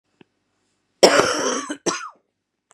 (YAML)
cough_length: 2.7 s
cough_amplitude: 32768
cough_signal_mean_std_ratio: 0.37
survey_phase: beta (2021-08-13 to 2022-03-07)
age: 18-44
gender: Female
wearing_mask: 'No'
symptom_cough_any: true
symptom_new_continuous_cough: true
symptom_runny_or_blocked_nose: true
symptom_shortness_of_breath: true
symptom_sore_throat: true
symptom_fatigue: true
symptom_headache: true
smoker_status: Current smoker (e-cigarettes or vapes only)
respiratory_condition_asthma: false
respiratory_condition_other: false
recruitment_source: Test and Trace
submission_delay: 2 days
covid_test_result: Positive
covid_test_method: LFT